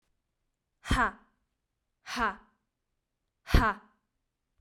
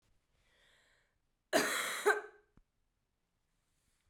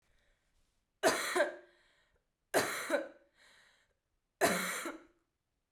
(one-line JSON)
{"exhalation_length": "4.6 s", "exhalation_amplitude": 14789, "exhalation_signal_mean_std_ratio": 0.27, "cough_length": "4.1 s", "cough_amplitude": 4901, "cough_signal_mean_std_ratio": 0.3, "three_cough_length": "5.7 s", "three_cough_amplitude": 5984, "three_cough_signal_mean_std_ratio": 0.39, "survey_phase": "beta (2021-08-13 to 2022-03-07)", "age": "18-44", "gender": "Female", "wearing_mask": "No", "symptom_runny_or_blocked_nose": true, "symptom_fatigue": true, "symptom_fever_high_temperature": true, "symptom_headache": true, "symptom_change_to_sense_of_smell_or_taste": true, "smoker_status": "Never smoked", "respiratory_condition_asthma": false, "respiratory_condition_other": false, "recruitment_source": "Test and Trace", "submission_delay": "1 day", "covid_test_result": "Positive", "covid_test_method": "RT-qPCR", "covid_ct_value": 15.5, "covid_ct_gene": "ORF1ab gene", "covid_ct_mean": 15.8, "covid_viral_load": "6500000 copies/ml", "covid_viral_load_category": "High viral load (>1M copies/ml)"}